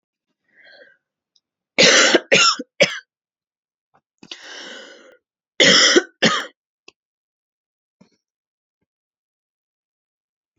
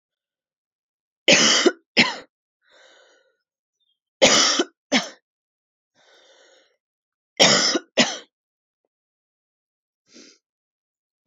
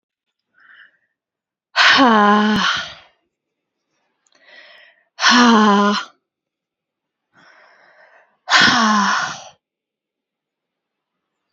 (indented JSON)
{
  "cough_length": "10.6 s",
  "cough_amplitude": 32768,
  "cough_signal_mean_std_ratio": 0.29,
  "three_cough_length": "11.3 s",
  "three_cough_amplitude": 29407,
  "three_cough_signal_mean_std_ratio": 0.3,
  "exhalation_length": "11.5 s",
  "exhalation_amplitude": 32767,
  "exhalation_signal_mean_std_ratio": 0.4,
  "survey_phase": "beta (2021-08-13 to 2022-03-07)",
  "age": "18-44",
  "gender": "Female",
  "wearing_mask": "No",
  "symptom_cough_any": true,
  "symptom_new_continuous_cough": true,
  "symptom_runny_or_blocked_nose": true,
  "symptom_sore_throat": true,
  "symptom_fatigue": true,
  "symptom_fever_high_temperature": true,
  "symptom_headache": true,
  "symptom_onset": "2 days",
  "smoker_status": "Never smoked",
  "respiratory_condition_asthma": false,
  "respiratory_condition_other": false,
  "recruitment_source": "Test and Trace",
  "submission_delay": "1 day",
  "covid_test_result": "Positive",
  "covid_test_method": "ePCR"
}